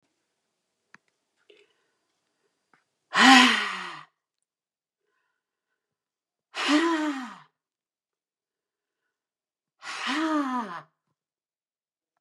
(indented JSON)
{
  "exhalation_length": "12.2 s",
  "exhalation_amplitude": 22795,
  "exhalation_signal_mean_std_ratio": 0.28,
  "survey_phase": "beta (2021-08-13 to 2022-03-07)",
  "age": "45-64",
  "gender": "Female",
  "wearing_mask": "No",
  "symptom_none": true,
  "smoker_status": "Never smoked",
  "respiratory_condition_asthma": false,
  "respiratory_condition_other": false,
  "recruitment_source": "REACT",
  "submission_delay": "1 day",
  "covid_test_result": "Negative",
  "covid_test_method": "RT-qPCR",
  "influenza_a_test_result": "Negative",
  "influenza_b_test_result": "Negative"
}